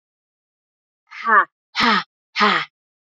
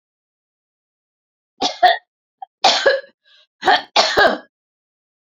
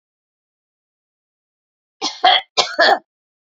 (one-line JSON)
{"exhalation_length": "3.1 s", "exhalation_amplitude": 26866, "exhalation_signal_mean_std_ratio": 0.39, "three_cough_length": "5.3 s", "three_cough_amplitude": 32767, "three_cough_signal_mean_std_ratio": 0.36, "cough_length": "3.6 s", "cough_amplitude": 30207, "cough_signal_mean_std_ratio": 0.3, "survey_phase": "beta (2021-08-13 to 2022-03-07)", "age": "65+", "gender": "Female", "wearing_mask": "No", "symptom_cough_any": true, "symptom_onset": "3 days", "smoker_status": "Never smoked", "respiratory_condition_asthma": false, "respiratory_condition_other": false, "recruitment_source": "Test and Trace", "submission_delay": "0 days", "covid_test_result": "Negative", "covid_test_method": "RT-qPCR"}